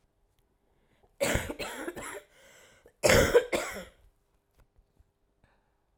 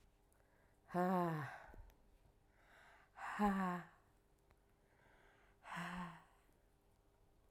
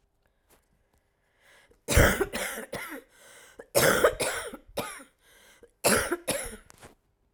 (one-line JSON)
{"cough_length": "6.0 s", "cough_amplitude": 15752, "cough_signal_mean_std_ratio": 0.32, "exhalation_length": "7.5 s", "exhalation_amplitude": 1584, "exhalation_signal_mean_std_ratio": 0.4, "three_cough_length": "7.3 s", "three_cough_amplitude": 18904, "three_cough_signal_mean_std_ratio": 0.39, "survey_phase": "alpha (2021-03-01 to 2021-08-12)", "age": "45-64", "gender": "Female", "wearing_mask": "No", "symptom_cough_any": true, "symptom_abdominal_pain": true, "symptom_diarrhoea": true, "symptom_fatigue": true, "symptom_headache": true, "symptom_change_to_sense_of_smell_or_taste": true, "symptom_loss_of_taste": true, "symptom_onset": "8 days", "smoker_status": "Ex-smoker", "respiratory_condition_asthma": false, "respiratory_condition_other": false, "recruitment_source": "Test and Trace", "submission_delay": "2 days", "covid_test_result": "Positive", "covid_test_method": "RT-qPCR", "covid_ct_value": 17.3, "covid_ct_gene": "ORF1ab gene", "covid_ct_mean": 18.0, "covid_viral_load": "1200000 copies/ml", "covid_viral_load_category": "High viral load (>1M copies/ml)"}